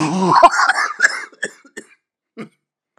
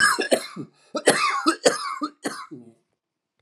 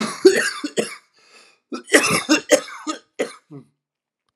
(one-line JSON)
{"exhalation_length": "3.0 s", "exhalation_amplitude": 32768, "exhalation_signal_mean_std_ratio": 0.47, "three_cough_length": "3.4 s", "three_cough_amplitude": 31592, "three_cough_signal_mean_std_ratio": 0.49, "cough_length": "4.4 s", "cough_amplitude": 32767, "cough_signal_mean_std_ratio": 0.4, "survey_phase": "alpha (2021-03-01 to 2021-08-12)", "age": "45-64", "gender": "Male", "wearing_mask": "No", "symptom_fatigue": true, "symptom_headache": true, "symptom_change_to_sense_of_smell_or_taste": true, "symptom_loss_of_taste": true, "symptom_onset": "6 days", "smoker_status": "Ex-smoker", "respiratory_condition_asthma": false, "respiratory_condition_other": false, "recruitment_source": "Test and Trace", "submission_delay": "3 days", "covid_test_result": "Positive", "covid_test_method": "RT-qPCR", "covid_ct_value": 15.7, "covid_ct_gene": "N gene", "covid_ct_mean": 17.0, "covid_viral_load": "2600000 copies/ml", "covid_viral_load_category": "High viral load (>1M copies/ml)"}